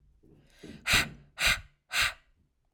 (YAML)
exhalation_length: 2.7 s
exhalation_amplitude: 10196
exhalation_signal_mean_std_ratio: 0.4
survey_phase: alpha (2021-03-01 to 2021-08-12)
age: 18-44
gender: Female
wearing_mask: 'No'
symptom_none: true
smoker_status: Ex-smoker
respiratory_condition_asthma: false
respiratory_condition_other: false
recruitment_source: REACT
submission_delay: 1 day
covid_test_result: Negative
covid_test_method: RT-qPCR